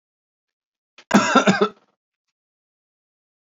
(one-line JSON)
{"cough_length": "3.4 s", "cough_amplitude": 27158, "cough_signal_mean_std_ratio": 0.29, "survey_phase": "beta (2021-08-13 to 2022-03-07)", "age": "45-64", "gender": "Male", "wearing_mask": "No", "symptom_none": true, "smoker_status": "Never smoked", "respiratory_condition_asthma": false, "respiratory_condition_other": false, "recruitment_source": "REACT", "submission_delay": "0 days", "covid_test_result": "Negative", "covid_test_method": "RT-qPCR", "influenza_a_test_result": "Negative", "influenza_b_test_result": "Negative"}